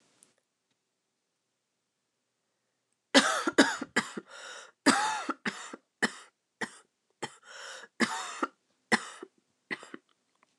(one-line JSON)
{"cough_length": "10.6 s", "cough_amplitude": 16332, "cough_signal_mean_std_ratio": 0.3, "survey_phase": "alpha (2021-03-01 to 2021-08-12)", "age": "18-44", "gender": "Female", "wearing_mask": "No", "symptom_cough_any": true, "symptom_fatigue": true, "symptom_headache": true, "symptom_change_to_sense_of_smell_or_taste": true, "symptom_loss_of_taste": true, "symptom_onset": "4 days", "smoker_status": "Never smoked", "respiratory_condition_asthma": false, "respiratory_condition_other": false, "recruitment_source": "Test and Trace", "submission_delay": "2 days", "covid_test_result": "Positive", "covid_test_method": "RT-qPCR", "covid_ct_value": 25.2, "covid_ct_gene": "N gene"}